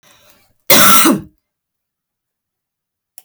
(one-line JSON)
{"cough_length": "3.2 s", "cough_amplitude": 32768, "cough_signal_mean_std_ratio": 0.34, "survey_phase": "beta (2021-08-13 to 2022-03-07)", "age": "45-64", "gender": "Female", "wearing_mask": "No", "symptom_none": true, "smoker_status": "Never smoked", "respiratory_condition_asthma": false, "respiratory_condition_other": false, "recruitment_source": "REACT", "submission_delay": "2 days", "covid_test_result": "Negative", "covid_test_method": "RT-qPCR"}